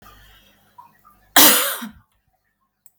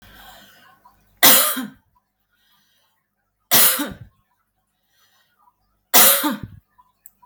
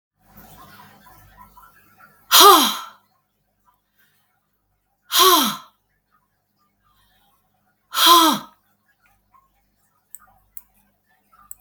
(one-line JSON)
{"cough_length": "3.0 s", "cough_amplitude": 32768, "cough_signal_mean_std_ratio": 0.28, "three_cough_length": "7.3 s", "three_cough_amplitude": 32768, "three_cough_signal_mean_std_ratio": 0.31, "exhalation_length": "11.6 s", "exhalation_amplitude": 32768, "exhalation_signal_mean_std_ratio": 0.26, "survey_phase": "beta (2021-08-13 to 2022-03-07)", "age": "45-64", "gender": "Female", "wearing_mask": "No", "symptom_none": true, "smoker_status": "Never smoked", "respiratory_condition_asthma": false, "respiratory_condition_other": false, "recruitment_source": "REACT", "submission_delay": "2 days", "covid_test_result": "Negative", "covid_test_method": "RT-qPCR", "influenza_a_test_result": "Unknown/Void", "influenza_b_test_result": "Unknown/Void"}